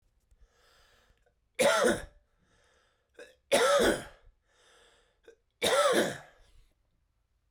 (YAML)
three_cough_length: 7.5 s
three_cough_amplitude: 7663
three_cough_signal_mean_std_ratio: 0.38
survey_phase: alpha (2021-03-01 to 2021-08-12)
age: 18-44
gender: Male
wearing_mask: 'No'
symptom_cough_any: true
symptom_headache: true
smoker_status: Never smoked
respiratory_condition_asthma: false
respiratory_condition_other: false
recruitment_source: Test and Trace
submission_delay: 2 days
covid_test_result: Positive
covid_test_method: RT-qPCR
covid_ct_value: 12.7
covid_ct_gene: N gene
covid_ct_mean: 13.5
covid_viral_load: 36000000 copies/ml
covid_viral_load_category: High viral load (>1M copies/ml)